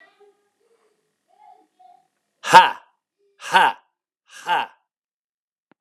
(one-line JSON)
{"exhalation_length": "5.8 s", "exhalation_amplitude": 32768, "exhalation_signal_mean_std_ratio": 0.22, "survey_phase": "alpha (2021-03-01 to 2021-08-12)", "age": "45-64", "gender": "Male", "wearing_mask": "No", "symptom_fatigue": true, "symptom_headache": true, "symptom_onset": "4 days", "smoker_status": "Never smoked", "respiratory_condition_asthma": true, "respiratory_condition_other": false, "recruitment_source": "Test and Trace", "submission_delay": "1 day", "covid_test_result": "Positive", "covid_test_method": "RT-qPCR"}